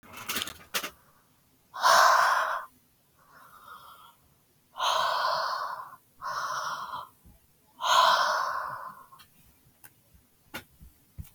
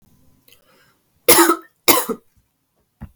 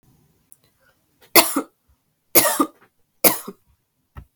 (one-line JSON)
{"exhalation_length": "11.3 s", "exhalation_amplitude": 15073, "exhalation_signal_mean_std_ratio": 0.46, "cough_length": "3.2 s", "cough_amplitude": 32768, "cough_signal_mean_std_ratio": 0.3, "three_cough_length": "4.4 s", "three_cough_amplitude": 32768, "three_cough_signal_mean_std_ratio": 0.27, "survey_phase": "beta (2021-08-13 to 2022-03-07)", "age": "18-44", "gender": "Female", "wearing_mask": "No", "symptom_none": true, "smoker_status": "Ex-smoker", "respiratory_condition_asthma": false, "respiratory_condition_other": false, "recruitment_source": "REACT", "submission_delay": "1 day", "covid_test_result": "Negative", "covid_test_method": "RT-qPCR", "influenza_a_test_result": "Negative", "influenza_b_test_result": "Negative"}